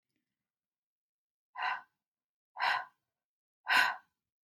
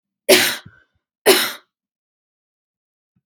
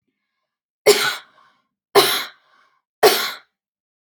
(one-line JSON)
{"exhalation_length": "4.5 s", "exhalation_amplitude": 7676, "exhalation_signal_mean_std_ratio": 0.3, "cough_length": "3.3 s", "cough_amplitude": 32685, "cough_signal_mean_std_ratio": 0.29, "three_cough_length": "4.1 s", "three_cough_amplitude": 31282, "three_cough_signal_mean_std_ratio": 0.32, "survey_phase": "alpha (2021-03-01 to 2021-08-12)", "age": "45-64", "gender": "Female", "wearing_mask": "No", "symptom_none": true, "smoker_status": "Never smoked", "respiratory_condition_asthma": false, "respiratory_condition_other": false, "recruitment_source": "REACT", "submission_delay": "2 days", "covid_test_result": "Negative", "covid_test_method": "RT-qPCR"}